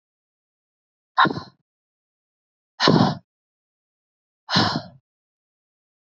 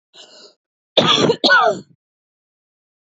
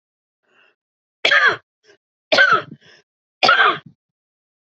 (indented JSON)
{
  "exhalation_length": "6.1 s",
  "exhalation_amplitude": 27406,
  "exhalation_signal_mean_std_ratio": 0.28,
  "cough_length": "3.1 s",
  "cough_amplitude": 32768,
  "cough_signal_mean_std_ratio": 0.41,
  "three_cough_length": "4.6 s",
  "three_cough_amplitude": 31169,
  "three_cough_signal_mean_std_ratio": 0.37,
  "survey_phase": "beta (2021-08-13 to 2022-03-07)",
  "age": "18-44",
  "gender": "Female",
  "wearing_mask": "No",
  "symptom_none": true,
  "smoker_status": "Ex-smoker",
  "respiratory_condition_asthma": false,
  "respiratory_condition_other": false,
  "recruitment_source": "REACT",
  "submission_delay": "2 days",
  "covid_test_result": "Negative",
  "covid_test_method": "RT-qPCR",
  "influenza_a_test_result": "Negative",
  "influenza_b_test_result": "Negative"
}